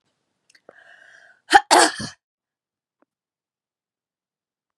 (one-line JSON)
{"cough_length": "4.8 s", "cough_amplitude": 32768, "cough_signal_mean_std_ratio": 0.2, "survey_phase": "beta (2021-08-13 to 2022-03-07)", "age": "45-64", "gender": "Female", "wearing_mask": "No", "symptom_headache": true, "smoker_status": "Never smoked", "respiratory_condition_asthma": false, "respiratory_condition_other": false, "recruitment_source": "Test and Trace", "submission_delay": "2 days", "covid_test_result": "Positive", "covid_test_method": "RT-qPCR", "covid_ct_value": 32.6, "covid_ct_gene": "ORF1ab gene"}